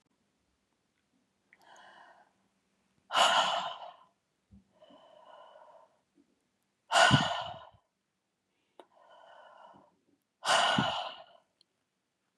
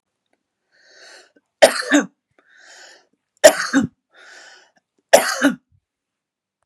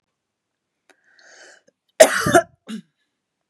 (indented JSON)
{
  "exhalation_length": "12.4 s",
  "exhalation_amplitude": 10913,
  "exhalation_signal_mean_std_ratio": 0.3,
  "three_cough_length": "6.7 s",
  "three_cough_amplitude": 32768,
  "three_cough_signal_mean_std_ratio": 0.27,
  "cough_length": "3.5 s",
  "cough_amplitude": 32768,
  "cough_signal_mean_std_ratio": 0.23,
  "survey_phase": "beta (2021-08-13 to 2022-03-07)",
  "age": "45-64",
  "gender": "Female",
  "wearing_mask": "No",
  "symptom_none": true,
  "smoker_status": "Ex-smoker",
  "respiratory_condition_asthma": false,
  "respiratory_condition_other": false,
  "recruitment_source": "REACT",
  "submission_delay": "1 day",
  "covid_test_result": "Negative",
  "covid_test_method": "RT-qPCR",
  "influenza_a_test_result": "Negative",
  "influenza_b_test_result": "Negative"
}